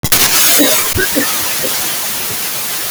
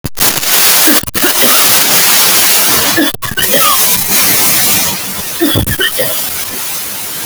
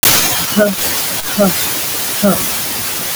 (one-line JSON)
{"cough_length": "2.9 s", "cough_amplitude": 32768, "cough_signal_mean_std_ratio": 1.13, "three_cough_length": "7.3 s", "three_cough_amplitude": 32768, "three_cough_signal_mean_std_ratio": 1.13, "exhalation_length": "3.2 s", "exhalation_amplitude": 32768, "exhalation_signal_mean_std_ratio": 1.08, "survey_phase": "beta (2021-08-13 to 2022-03-07)", "age": "45-64", "gender": "Female", "wearing_mask": "No", "symptom_diarrhoea": true, "symptom_onset": "12 days", "smoker_status": "Ex-smoker", "respiratory_condition_asthma": false, "respiratory_condition_other": false, "recruitment_source": "REACT", "submission_delay": "3 days", "covid_test_result": "Negative", "covid_test_method": "RT-qPCR"}